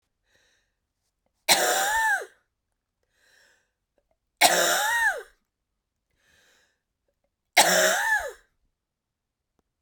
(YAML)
three_cough_length: 9.8 s
three_cough_amplitude: 24245
three_cough_signal_mean_std_ratio: 0.38
survey_phase: beta (2021-08-13 to 2022-03-07)
age: 45-64
gender: Female
wearing_mask: 'No'
symptom_cough_any: true
symptom_new_continuous_cough: true
symptom_runny_or_blocked_nose: true
symptom_sore_throat: true
symptom_fatigue: true
symptom_fever_high_temperature: true
symptom_headache: true
symptom_change_to_sense_of_smell_or_taste: true
symptom_loss_of_taste: true
symptom_other: true
symptom_onset: 6 days
smoker_status: Never smoked
respiratory_condition_asthma: false
respiratory_condition_other: false
recruitment_source: Test and Trace
submission_delay: 2 days
covid_test_result: Positive
covid_test_method: RT-qPCR
covid_ct_value: 20.2
covid_ct_gene: ORF1ab gene